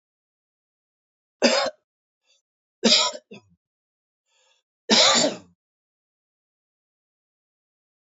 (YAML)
three_cough_length: 8.1 s
three_cough_amplitude: 24983
three_cough_signal_mean_std_ratio: 0.27
survey_phase: beta (2021-08-13 to 2022-03-07)
age: 65+
gender: Male
wearing_mask: 'No'
symptom_cough_any: true
symptom_shortness_of_breath: true
symptom_change_to_sense_of_smell_or_taste: true
symptom_onset: 9 days
smoker_status: Never smoked
respiratory_condition_asthma: false
respiratory_condition_other: false
recruitment_source: Test and Trace
submission_delay: 2 days
covid_test_result: Positive
covid_test_method: RT-qPCR
covid_ct_value: 13.5
covid_ct_gene: S gene
covid_ct_mean: 14.3
covid_viral_load: 20000000 copies/ml
covid_viral_load_category: High viral load (>1M copies/ml)